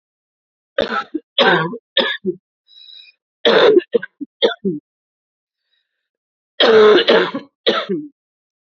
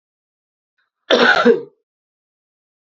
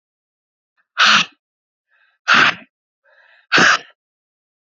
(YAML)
three_cough_length: 8.6 s
three_cough_amplitude: 30847
three_cough_signal_mean_std_ratio: 0.43
cough_length: 3.0 s
cough_amplitude: 32768
cough_signal_mean_std_ratio: 0.32
exhalation_length: 4.6 s
exhalation_amplitude: 30106
exhalation_signal_mean_std_ratio: 0.34
survey_phase: beta (2021-08-13 to 2022-03-07)
age: 45-64
gender: Female
wearing_mask: 'No'
symptom_runny_or_blocked_nose: true
symptom_diarrhoea: true
symptom_fatigue: true
symptom_headache: true
symptom_change_to_sense_of_smell_or_taste: true
symptom_loss_of_taste: true
symptom_onset: 2 days
smoker_status: Current smoker (1 to 10 cigarettes per day)
respiratory_condition_asthma: false
respiratory_condition_other: false
recruitment_source: Test and Trace
submission_delay: 1 day
covid_test_result: Positive
covid_test_method: RT-qPCR
covid_ct_value: 20.4
covid_ct_gene: ORF1ab gene